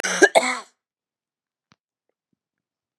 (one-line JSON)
{"cough_length": "3.0 s", "cough_amplitude": 32137, "cough_signal_mean_std_ratio": 0.25, "survey_phase": "beta (2021-08-13 to 2022-03-07)", "age": "45-64", "gender": "Female", "wearing_mask": "No", "symptom_cough_any": true, "symptom_runny_or_blocked_nose": true, "symptom_sore_throat": true, "symptom_onset": "1 day", "smoker_status": "Ex-smoker", "respiratory_condition_asthma": false, "respiratory_condition_other": false, "recruitment_source": "Test and Trace", "submission_delay": "1 day", "covid_test_result": "Positive", "covid_test_method": "LAMP"}